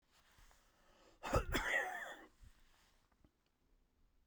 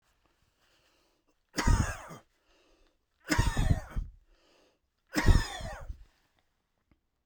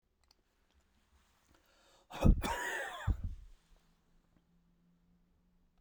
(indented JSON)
{
  "cough_length": "4.3 s",
  "cough_amplitude": 2683,
  "cough_signal_mean_std_ratio": 0.37,
  "three_cough_length": "7.3 s",
  "three_cough_amplitude": 11795,
  "three_cough_signal_mean_std_ratio": 0.33,
  "exhalation_length": "5.8 s",
  "exhalation_amplitude": 6525,
  "exhalation_signal_mean_std_ratio": 0.27,
  "survey_phase": "beta (2021-08-13 to 2022-03-07)",
  "age": "65+",
  "gender": "Male",
  "wearing_mask": "No",
  "symptom_none": true,
  "smoker_status": "Ex-smoker",
  "respiratory_condition_asthma": false,
  "respiratory_condition_other": false,
  "recruitment_source": "REACT",
  "submission_delay": "9 days",
  "covid_test_result": "Negative",
  "covid_test_method": "RT-qPCR"
}